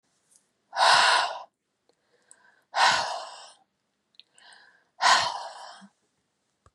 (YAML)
exhalation_length: 6.7 s
exhalation_amplitude: 19044
exhalation_signal_mean_std_ratio: 0.37
survey_phase: beta (2021-08-13 to 2022-03-07)
age: 45-64
gender: Female
wearing_mask: 'No'
symptom_none: true
smoker_status: Never smoked
respiratory_condition_asthma: false
respiratory_condition_other: false
recruitment_source: REACT
submission_delay: 1 day
covid_test_result: Negative
covid_test_method: RT-qPCR
influenza_a_test_result: Negative
influenza_b_test_result: Negative